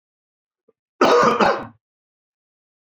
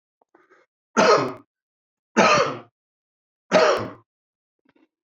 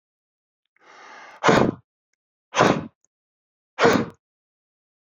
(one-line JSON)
{"cough_length": "2.8 s", "cough_amplitude": 26408, "cough_signal_mean_std_ratio": 0.37, "three_cough_length": "5.0 s", "three_cough_amplitude": 24974, "three_cough_signal_mean_std_ratio": 0.37, "exhalation_length": "5.0 s", "exhalation_amplitude": 26136, "exhalation_signal_mean_std_ratio": 0.31, "survey_phase": "beta (2021-08-13 to 2022-03-07)", "age": "45-64", "gender": "Male", "wearing_mask": "No", "symptom_none": true, "smoker_status": "Never smoked", "respiratory_condition_asthma": false, "respiratory_condition_other": false, "recruitment_source": "REACT", "submission_delay": "2 days", "covid_test_result": "Negative", "covid_test_method": "RT-qPCR"}